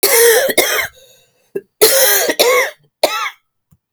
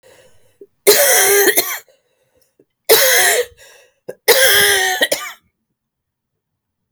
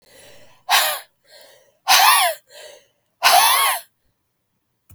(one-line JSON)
{"cough_length": "3.9 s", "cough_amplitude": 32768, "cough_signal_mean_std_ratio": 0.61, "three_cough_length": "6.9 s", "three_cough_amplitude": 32768, "three_cough_signal_mean_std_ratio": 0.49, "exhalation_length": "4.9 s", "exhalation_amplitude": 32766, "exhalation_signal_mean_std_ratio": 0.43, "survey_phase": "beta (2021-08-13 to 2022-03-07)", "age": "45-64", "gender": "Female", "wearing_mask": "No", "symptom_cough_any": true, "symptom_runny_or_blocked_nose": true, "symptom_shortness_of_breath": true, "symptom_sore_throat": true, "symptom_fatigue": true, "symptom_fever_high_temperature": true, "symptom_change_to_sense_of_smell_or_taste": true, "symptom_onset": "2 days", "smoker_status": "Ex-smoker", "respiratory_condition_asthma": true, "respiratory_condition_other": false, "recruitment_source": "Test and Trace", "submission_delay": "1 day", "covid_test_result": "Positive", "covid_test_method": "RT-qPCR", "covid_ct_value": 20.8, "covid_ct_gene": "ORF1ab gene", "covid_ct_mean": 21.3, "covid_viral_load": "110000 copies/ml", "covid_viral_load_category": "Low viral load (10K-1M copies/ml)"}